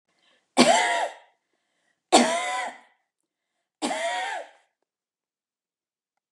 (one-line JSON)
{"three_cough_length": "6.3 s", "three_cough_amplitude": 24913, "three_cough_signal_mean_std_ratio": 0.36, "survey_phase": "beta (2021-08-13 to 2022-03-07)", "age": "65+", "gender": "Female", "wearing_mask": "No", "symptom_none": true, "smoker_status": "Ex-smoker", "respiratory_condition_asthma": false, "respiratory_condition_other": false, "recruitment_source": "REACT", "submission_delay": "3 days", "covid_test_result": "Negative", "covid_test_method": "RT-qPCR", "influenza_a_test_result": "Negative", "influenza_b_test_result": "Negative"}